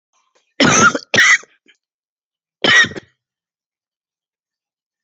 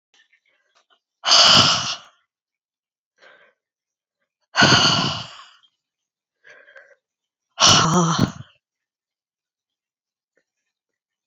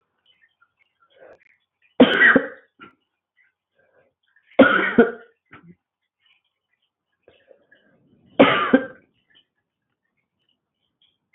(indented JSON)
{
  "cough_length": "5.0 s",
  "cough_amplitude": 30906,
  "cough_signal_mean_std_ratio": 0.34,
  "exhalation_length": "11.3 s",
  "exhalation_amplitude": 31207,
  "exhalation_signal_mean_std_ratio": 0.33,
  "three_cough_length": "11.3 s",
  "three_cough_amplitude": 27595,
  "three_cough_signal_mean_std_ratio": 0.25,
  "survey_phase": "alpha (2021-03-01 to 2021-08-12)",
  "age": "45-64",
  "gender": "Female",
  "wearing_mask": "No",
  "symptom_new_continuous_cough": true,
  "symptom_shortness_of_breath": true,
  "symptom_diarrhoea": true,
  "symptom_fatigue": true,
  "symptom_headache": true,
  "symptom_loss_of_taste": true,
  "smoker_status": "Ex-smoker",
  "respiratory_condition_asthma": false,
  "respiratory_condition_other": false,
  "recruitment_source": "Test and Trace",
  "submission_delay": "2 days",
  "covid_test_result": "Positive",
  "covid_test_method": "RT-qPCR",
  "covid_ct_value": 22.5,
  "covid_ct_gene": "ORF1ab gene"
}